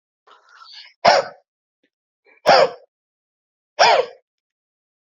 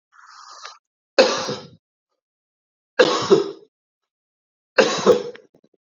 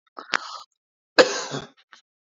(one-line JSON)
{"exhalation_length": "5.0 s", "exhalation_amplitude": 30031, "exhalation_signal_mean_std_ratio": 0.3, "three_cough_length": "5.9 s", "three_cough_amplitude": 30331, "three_cough_signal_mean_std_ratio": 0.33, "cough_length": "2.4 s", "cough_amplitude": 28585, "cough_signal_mean_std_ratio": 0.25, "survey_phase": "beta (2021-08-13 to 2022-03-07)", "age": "45-64", "gender": "Male", "wearing_mask": "No", "symptom_none": true, "smoker_status": "Never smoked", "respiratory_condition_asthma": true, "respiratory_condition_other": false, "recruitment_source": "REACT", "submission_delay": "2 days", "covid_test_result": "Negative", "covid_test_method": "RT-qPCR"}